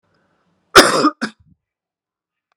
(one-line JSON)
{"cough_length": "2.6 s", "cough_amplitude": 32768, "cough_signal_mean_std_ratio": 0.27, "survey_phase": "beta (2021-08-13 to 2022-03-07)", "age": "45-64", "gender": "Male", "wearing_mask": "No", "symptom_cough_any": true, "symptom_runny_or_blocked_nose": true, "symptom_sore_throat": true, "symptom_onset": "4 days", "smoker_status": "Never smoked", "respiratory_condition_asthma": false, "respiratory_condition_other": false, "recruitment_source": "Test and Trace", "submission_delay": "2 days", "covid_test_result": "Positive", "covid_test_method": "RT-qPCR", "covid_ct_value": 15.1, "covid_ct_gene": "ORF1ab gene", "covid_ct_mean": 15.4, "covid_viral_load": "9100000 copies/ml", "covid_viral_load_category": "High viral load (>1M copies/ml)"}